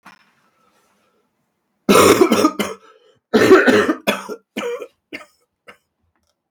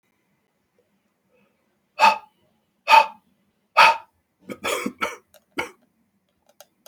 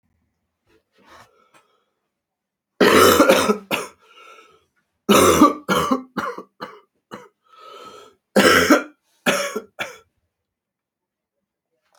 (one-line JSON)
{"cough_length": "6.5 s", "cough_amplitude": 32768, "cough_signal_mean_std_ratio": 0.39, "exhalation_length": "6.9 s", "exhalation_amplitude": 28520, "exhalation_signal_mean_std_ratio": 0.26, "three_cough_length": "12.0 s", "three_cough_amplitude": 32762, "three_cough_signal_mean_std_ratio": 0.36, "survey_phase": "beta (2021-08-13 to 2022-03-07)", "age": "45-64", "gender": "Male", "wearing_mask": "No", "symptom_cough_any": true, "symptom_runny_or_blocked_nose": true, "symptom_sore_throat": true, "symptom_fatigue": true, "symptom_fever_high_temperature": true, "symptom_headache": true, "symptom_onset": "3 days", "smoker_status": "Never smoked", "respiratory_condition_asthma": true, "respiratory_condition_other": false, "recruitment_source": "Test and Trace", "submission_delay": "1 day", "covid_test_result": "Positive", "covid_test_method": "RT-qPCR", "covid_ct_value": 22.2, "covid_ct_gene": "ORF1ab gene", "covid_ct_mean": 23.5, "covid_viral_load": "19000 copies/ml", "covid_viral_load_category": "Low viral load (10K-1M copies/ml)"}